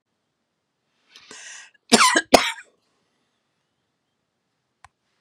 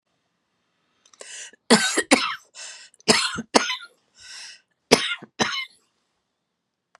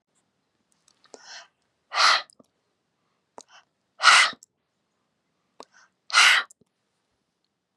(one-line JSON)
{"cough_length": "5.2 s", "cough_amplitude": 32768, "cough_signal_mean_std_ratio": 0.21, "three_cough_length": "7.0 s", "three_cough_amplitude": 32767, "three_cough_signal_mean_std_ratio": 0.33, "exhalation_length": "7.8 s", "exhalation_amplitude": 28943, "exhalation_signal_mean_std_ratio": 0.26, "survey_phase": "beta (2021-08-13 to 2022-03-07)", "age": "65+", "gender": "Female", "wearing_mask": "No", "symptom_cough_any": true, "smoker_status": "Ex-smoker", "respiratory_condition_asthma": false, "respiratory_condition_other": false, "recruitment_source": "REACT", "submission_delay": "10 days", "covid_test_result": "Negative", "covid_test_method": "RT-qPCR"}